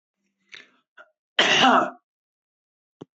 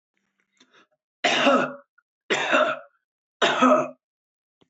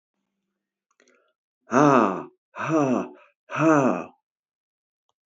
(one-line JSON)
{"cough_length": "3.2 s", "cough_amplitude": 21640, "cough_signal_mean_std_ratio": 0.32, "three_cough_length": "4.7 s", "three_cough_amplitude": 17423, "three_cough_signal_mean_std_ratio": 0.44, "exhalation_length": "5.3 s", "exhalation_amplitude": 20866, "exhalation_signal_mean_std_ratio": 0.39, "survey_phase": "alpha (2021-03-01 to 2021-08-12)", "age": "65+", "gender": "Male", "wearing_mask": "No", "symptom_cough_any": true, "symptom_fatigue": true, "symptom_loss_of_taste": true, "symptom_onset": "13 days", "smoker_status": "Ex-smoker", "respiratory_condition_asthma": false, "respiratory_condition_other": false, "recruitment_source": "REACT", "submission_delay": "2 days", "covid_test_result": "Negative", "covid_test_method": "RT-qPCR"}